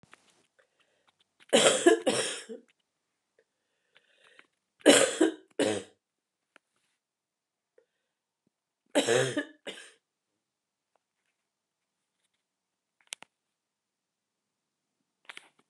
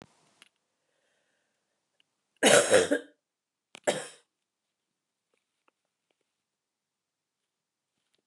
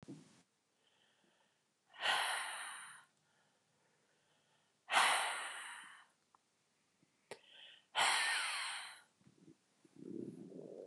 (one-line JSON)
{"three_cough_length": "15.7 s", "three_cough_amplitude": 17579, "three_cough_signal_mean_std_ratio": 0.24, "cough_length": "8.3 s", "cough_amplitude": 16530, "cough_signal_mean_std_ratio": 0.21, "exhalation_length": "10.9 s", "exhalation_amplitude": 3906, "exhalation_signal_mean_std_ratio": 0.41, "survey_phase": "beta (2021-08-13 to 2022-03-07)", "age": "65+", "gender": "Female", "wearing_mask": "No", "symptom_cough_any": true, "symptom_runny_or_blocked_nose": true, "symptom_fatigue": true, "symptom_other": true, "symptom_onset": "4 days", "smoker_status": "Ex-smoker", "respiratory_condition_asthma": false, "respiratory_condition_other": false, "recruitment_source": "Test and Trace", "submission_delay": "2 days", "covid_test_result": "Positive", "covid_test_method": "ePCR"}